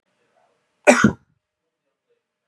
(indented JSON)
{
  "cough_length": "2.5 s",
  "cough_amplitude": 32753,
  "cough_signal_mean_std_ratio": 0.22,
  "survey_phase": "beta (2021-08-13 to 2022-03-07)",
  "age": "45-64",
  "gender": "Male",
  "wearing_mask": "No",
  "symptom_fatigue": true,
  "symptom_fever_high_temperature": true,
  "symptom_headache": true,
  "symptom_onset": "5 days",
  "smoker_status": "Ex-smoker",
  "respiratory_condition_asthma": false,
  "respiratory_condition_other": false,
  "recruitment_source": "Test and Trace",
  "submission_delay": "2 days",
  "covid_test_result": "Positive",
  "covid_test_method": "RT-qPCR",
  "covid_ct_value": 23.0,
  "covid_ct_gene": "N gene"
}